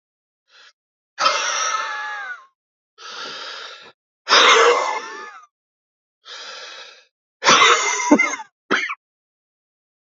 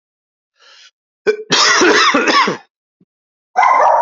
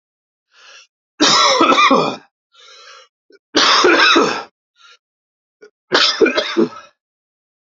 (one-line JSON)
{"exhalation_length": "10.2 s", "exhalation_amplitude": 30192, "exhalation_signal_mean_std_ratio": 0.43, "cough_length": "4.0 s", "cough_amplitude": 32768, "cough_signal_mean_std_ratio": 0.57, "three_cough_length": "7.7 s", "three_cough_amplitude": 32294, "three_cough_signal_mean_std_ratio": 0.48, "survey_phase": "alpha (2021-03-01 to 2021-08-12)", "age": "45-64", "gender": "Male", "wearing_mask": "No", "symptom_cough_any": true, "symptom_headache": true, "symptom_onset": "3 days", "smoker_status": "Never smoked", "respiratory_condition_asthma": false, "respiratory_condition_other": false, "recruitment_source": "Test and Trace", "submission_delay": "2 days", "covid_test_result": "Positive", "covid_test_method": "RT-qPCR", "covid_ct_value": 15.3, "covid_ct_gene": "ORF1ab gene", "covid_ct_mean": 15.7, "covid_viral_load": "7200000 copies/ml", "covid_viral_load_category": "High viral load (>1M copies/ml)"}